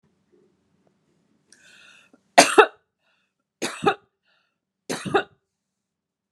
{
  "three_cough_length": "6.3 s",
  "three_cough_amplitude": 32768,
  "three_cough_signal_mean_std_ratio": 0.21,
  "survey_phase": "beta (2021-08-13 to 2022-03-07)",
  "age": "45-64",
  "gender": "Female",
  "wearing_mask": "No",
  "symptom_none": true,
  "smoker_status": "Never smoked",
  "respiratory_condition_asthma": false,
  "respiratory_condition_other": false,
  "recruitment_source": "REACT",
  "submission_delay": "2 days",
  "covid_test_result": "Negative",
  "covid_test_method": "RT-qPCR"
}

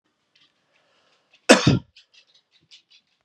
{
  "cough_length": "3.2 s",
  "cough_amplitude": 32768,
  "cough_signal_mean_std_ratio": 0.21,
  "survey_phase": "beta (2021-08-13 to 2022-03-07)",
  "age": "18-44",
  "gender": "Male",
  "wearing_mask": "No",
  "symptom_cough_any": true,
  "symptom_sore_throat": true,
  "symptom_headache": true,
  "symptom_change_to_sense_of_smell_or_taste": true,
  "symptom_onset": "4 days",
  "smoker_status": "Never smoked",
  "respiratory_condition_asthma": false,
  "respiratory_condition_other": false,
  "recruitment_source": "Test and Trace",
  "submission_delay": "1 day",
  "covid_test_result": "Positive",
  "covid_test_method": "RT-qPCR",
  "covid_ct_value": 16.3,
  "covid_ct_gene": "ORF1ab gene",
  "covid_ct_mean": 16.6,
  "covid_viral_load": "3600000 copies/ml",
  "covid_viral_load_category": "High viral load (>1M copies/ml)"
}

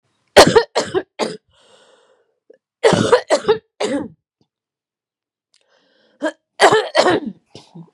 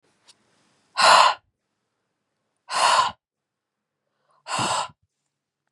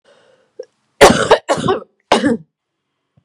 {
  "three_cough_length": "7.9 s",
  "three_cough_amplitude": 32768,
  "three_cough_signal_mean_std_ratio": 0.36,
  "exhalation_length": "5.7 s",
  "exhalation_amplitude": 28607,
  "exhalation_signal_mean_std_ratio": 0.33,
  "cough_length": "3.2 s",
  "cough_amplitude": 32768,
  "cough_signal_mean_std_ratio": 0.38,
  "survey_phase": "beta (2021-08-13 to 2022-03-07)",
  "age": "45-64",
  "gender": "Female",
  "wearing_mask": "No",
  "symptom_cough_any": true,
  "symptom_fatigue": true,
  "symptom_onset": "4 days",
  "smoker_status": "Never smoked",
  "respiratory_condition_asthma": false,
  "respiratory_condition_other": false,
  "recruitment_source": "Test and Trace",
  "submission_delay": "2 days",
  "covid_test_result": "Positive",
  "covid_test_method": "RT-qPCR"
}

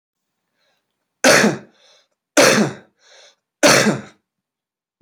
{
  "three_cough_length": "5.0 s",
  "three_cough_amplitude": 32768,
  "three_cough_signal_mean_std_ratio": 0.36,
  "survey_phase": "beta (2021-08-13 to 2022-03-07)",
  "age": "18-44",
  "gender": "Male",
  "wearing_mask": "No",
  "symptom_cough_any": true,
  "symptom_sore_throat": true,
  "symptom_other": true,
  "symptom_onset": "2 days",
  "smoker_status": "Never smoked",
  "respiratory_condition_asthma": false,
  "respiratory_condition_other": false,
  "recruitment_source": "Test and Trace",
  "submission_delay": "1 day",
  "covid_test_result": "Positive",
  "covid_test_method": "RT-qPCR",
  "covid_ct_value": 20.1,
  "covid_ct_gene": "ORF1ab gene"
}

